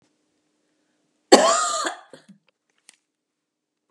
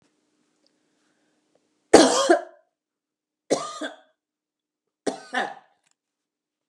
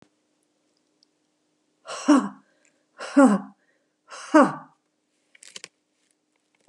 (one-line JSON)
{"cough_length": "3.9 s", "cough_amplitude": 32768, "cough_signal_mean_std_ratio": 0.26, "three_cough_length": "6.7 s", "three_cough_amplitude": 32768, "three_cough_signal_mean_std_ratio": 0.24, "exhalation_length": "6.7 s", "exhalation_amplitude": 25135, "exhalation_signal_mean_std_ratio": 0.26, "survey_phase": "beta (2021-08-13 to 2022-03-07)", "age": "65+", "gender": "Female", "wearing_mask": "No", "symptom_runny_or_blocked_nose": true, "symptom_onset": "12 days", "smoker_status": "Never smoked", "respiratory_condition_asthma": false, "respiratory_condition_other": false, "recruitment_source": "REACT", "submission_delay": "2 days", "covid_test_result": "Negative", "covid_test_method": "RT-qPCR", "influenza_a_test_result": "Negative", "influenza_b_test_result": "Negative"}